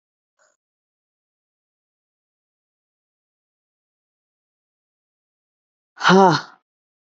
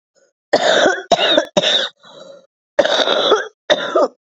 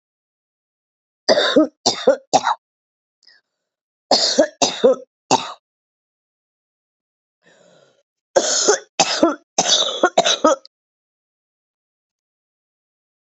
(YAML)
exhalation_length: 7.2 s
exhalation_amplitude: 25645
exhalation_signal_mean_std_ratio: 0.17
cough_length: 4.4 s
cough_amplitude: 30874
cough_signal_mean_std_ratio: 0.59
three_cough_length: 13.3 s
three_cough_amplitude: 32768
three_cough_signal_mean_std_ratio: 0.36
survey_phase: beta (2021-08-13 to 2022-03-07)
age: 45-64
gender: Female
wearing_mask: 'No'
symptom_new_continuous_cough: true
symptom_sore_throat: true
symptom_abdominal_pain: true
symptom_fever_high_temperature: true
symptom_onset: 7 days
smoker_status: Never smoked
respiratory_condition_asthma: true
respiratory_condition_other: false
recruitment_source: Test and Trace
submission_delay: 1 day
covid_test_result: Negative
covid_test_method: RT-qPCR